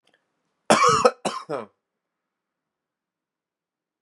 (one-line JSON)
{"cough_length": "4.0 s", "cough_amplitude": 30354, "cough_signal_mean_std_ratio": 0.28, "survey_phase": "beta (2021-08-13 to 2022-03-07)", "age": "18-44", "gender": "Male", "wearing_mask": "No", "symptom_cough_any": true, "symptom_runny_or_blocked_nose": true, "symptom_sore_throat": true, "symptom_headache": true, "symptom_change_to_sense_of_smell_or_taste": true, "smoker_status": "Ex-smoker", "respiratory_condition_asthma": false, "respiratory_condition_other": false, "recruitment_source": "Test and Trace", "submission_delay": "2 days", "covid_test_result": "Positive", "covid_test_method": "LFT"}